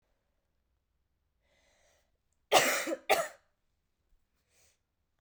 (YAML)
cough_length: 5.2 s
cough_amplitude: 10714
cough_signal_mean_std_ratio: 0.25
survey_phase: beta (2021-08-13 to 2022-03-07)
age: 18-44
gender: Male
wearing_mask: 'No'
symptom_new_continuous_cough: true
symptom_runny_or_blocked_nose: true
symptom_change_to_sense_of_smell_or_taste: true
symptom_loss_of_taste: true
symptom_other: true
smoker_status: Never smoked
respiratory_condition_asthma: false
respiratory_condition_other: false
recruitment_source: Test and Trace
submission_delay: 2 days
covid_test_result: Negative
covid_test_method: RT-qPCR